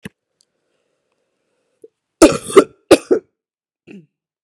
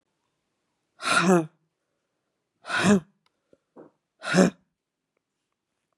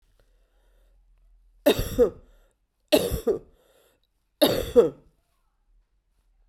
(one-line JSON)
{"cough_length": "4.4 s", "cough_amplitude": 32768, "cough_signal_mean_std_ratio": 0.22, "exhalation_length": "6.0 s", "exhalation_amplitude": 24106, "exhalation_signal_mean_std_ratio": 0.31, "three_cough_length": "6.5 s", "three_cough_amplitude": 19567, "three_cough_signal_mean_std_ratio": 0.31, "survey_phase": "beta (2021-08-13 to 2022-03-07)", "age": "18-44", "gender": "Female", "wearing_mask": "No", "symptom_cough_any": true, "symptom_runny_or_blocked_nose": true, "symptom_sore_throat": true, "symptom_fatigue": true, "symptom_fever_high_temperature": true, "symptom_headache": true, "symptom_change_to_sense_of_smell_or_taste": true, "symptom_onset": "3 days", "smoker_status": "Current smoker (1 to 10 cigarettes per day)", "respiratory_condition_asthma": false, "respiratory_condition_other": false, "recruitment_source": "Test and Trace", "submission_delay": "1 day", "covid_test_result": "Positive", "covid_test_method": "ePCR"}